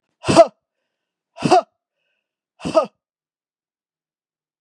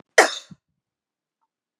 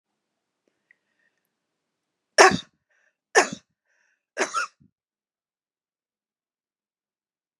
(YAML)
exhalation_length: 4.6 s
exhalation_amplitude: 32767
exhalation_signal_mean_std_ratio: 0.24
cough_length: 1.8 s
cough_amplitude: 32767
cough_signal_mean_std_ratio: 0.19
three_cough_length: 7.6 s
three_cough_amplitude: 32686
three_cough_signal_mean_std_ratio: 0.17
survey_phase: beta (2021-08-13 to 2022-03-07)
age: 45-64
gender: Female
wearing_mask: 'No'
symptom_none: true
smoker_status: Never smoked
respiratory_condition_asthma: false
respiratory_condition_other: false
recruitment_source: Test and Trace
submission_delay: 0 days
covid_test_result: Negative
covid_test_method: LFT